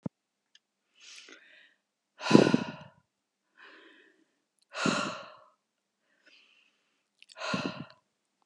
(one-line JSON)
{"exhalation_length": "8.5 s", "exhalation_amplitude": 25696, "exhalation_signal_mean_std_ratio": 0.23, "survey_phase": "beta (2021-08-13 to 2022-03-07)", "age": "45-64", "gender": "Female", "wearing_mask": "No", "symptom_fatigue": true, "smoker_status": "Current smoker (e-cigarettes or vapes only)", "respiratory_condition_asthma": false, "respiratory_condition_other": false, "recruitment_source": "REACT", "submission_delay": "1 day", "covid_test_result": "Negative", "covid_test_method": "RT-qPCR", "influenza_a_test_result": "Negative", "influenza_b_test_result": "Negative"}